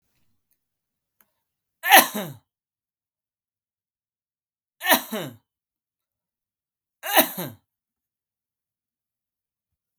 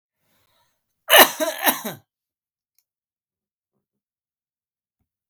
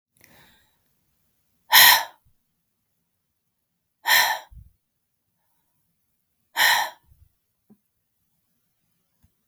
three_cough_length: 10.0 s
three_cough_amplitude: 32768
three_cough_signal_mean_std_ratio: 0.19
cough_length: 5.3 s
cough_amplitude: 32768
cough_signal_mean_std_ratio: 0.21
exhalation_length: 9.5 s
exhalation_amplitude: 32768
exhalation_signal_mean_std_ratio: 0.23
survey_phase: beta (2021-08-13 to 2022-03-07)
age: 18-44
gender: Male
wearing_mask: 'No'
symptom_runny_or_blocked_nose: true
symptom_sore_throat: true
symptom_fatigue: true
symptom_onset: 2 days
smoker_status: Never smoked
respiratory_condition_asthma: false
respiratory_condition_other: false
recruitment_source: Test and Trace
submission_delay: 2 days
covid_test_result: Positive
covid_test_method: RT-qPCR
covid_ct_value: 29.3
covid_ct_gene: N gene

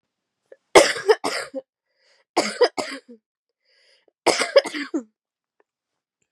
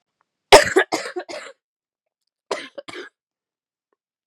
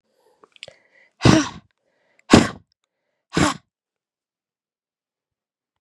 three_cough_length: 6.3 s
three_cough_amplitude: 32767
three_cough_signal_mean_std_ratio: 0.3
cough_length: 4.3 s
cough_amplitude: 32768
cough_signal_mean_std_ratio: 0.22
exhalation_length: 5.8 s
exhalation_amplitude: 32768
exhalation_signal_mean_std_ratio: 0.22
survey_phase: beta (2021-08-13 to 2022-03-07)
age: 18-44
gender: Female
wearing_mask: 'No'
symptom_cough_any: true
symptom_new_continuous_cough: true
symptom_runny_or_blocked_nose: true
symptom_fatigue: true
symptom_change_to_sense_of_smell_or_taste: true
symptom_onset: 4 days
smoker_status: Never smoked
respiratory_condition_asthma: false
respiratory_condition_other: false
recruitment_source: Test and Trace
submission_delay: 2 days
covid_test_result: Positive
covid_test_method: RT-qPCR
covid_ct_value: 19.7
covid_ct_gene: ORF1ab gene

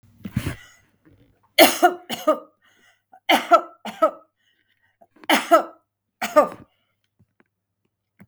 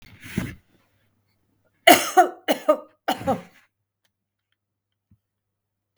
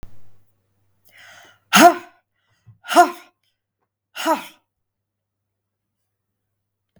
three_cough_length: 8.3 s
three_cough_amplitude: 32766
three_cough_signal_mean_std_ratio: 0.3
cough_length: 6.0 s
cough_amplitude: 32768
cough_signal_mean_std_ratio: 0.25
exhalation_length: 7.0 s
exhalation_amplitude: 32768
exhalation_signal_mean_std_ratio: 0.22
survey_phase: beta (2021-08-13 to 2022-03-07)
age: 65+
gender: Female
wearing_mask: 'No'
symptom_none: true
smoker_status: Ex-smoker
respiratory_condition_asthma: false
respiratory_condition_other: false
recruitment_source: REACT
submission_delay: 3 days
covid_test_result: Negative
covid_test_method: RT-qPCR
influenza_a_test_result: Negative
influenza_b_test_result: Negative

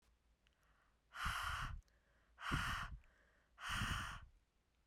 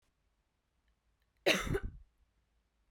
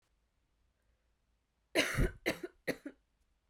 exhalation_length: 4.9 s
exhalation_amplitude: 1667
exhalation_signal_mean_std_ratio: 0.54
cough_length: 2.9 s
cough_amplitude: 6287
cough_signal_mean_std_ratio: 0.28
three_cough_length: 3.5 s
three_cough_amplitude: 5579
three_cough_signal_mean_std_ratio: 0.31
survey_phase: beta (2021-08-13 to 2022-03-07)
age: 18-44
gender: Female
wearing_mask: 'No'
symptom_cough_any: true
symptom_shortness_of_breath: true
symptom_fatigue: true
symptom_change_to_sense_of_smell_or_taste: true
symptom_loss_of_taste: true
symptom_onset: 8 days
smoker_status: Never smoked
respiratory_condition_asthma: false
respiratory_condition_other: false
recruitment_source: Test and Trace
submission_delay: 2 days
covid_test_result: Positive
covid_test_method: RT-qPCR
covid_ct_value: 17.4
covid_ct_gene: ORF1ab gene
covid_ct_mean: 18.2
covid_viral_load: 1100000 copies/ml
covid_viral_load_category: High viral load (>1M copies/ml)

